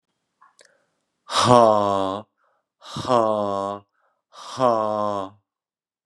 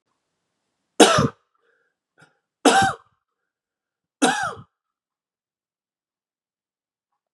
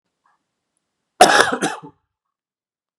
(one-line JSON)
{"exhalation_length": "6.1 s", "exhalation_amplitude": 31559, "exhalation_signal_mean_std_ratio": 0.41, "three_cough_length": "7.3 s", "three_cough_amplitude": 32531, "three_cough_signal_mean_std_ratio": 0.25, "cough_length": "3.0 s", "cough_amplitude": 32768, "cough_signal_mean_std_ratio": 0.27, "survey_phase": "beta (2021-08-13 to 2022-03-07)", "age": "18-44", "gender": "Male", "wearing_mask": "No", "symptom_cough_any": true, "symptom_runny_or_blocked_nose": true, "symptom_sore_throat": true, "symptom_change_to_sense_of_smell_or_taste": true, "smoker_status": "Never smoked", "respiratory_condition_asthma": false, "respiratory_condition_other": false, "recruitment_source": "Test and Trace", "submission_delay": "1 day", "covid_test_result": "Positive", "covid_test_method": "LFT"}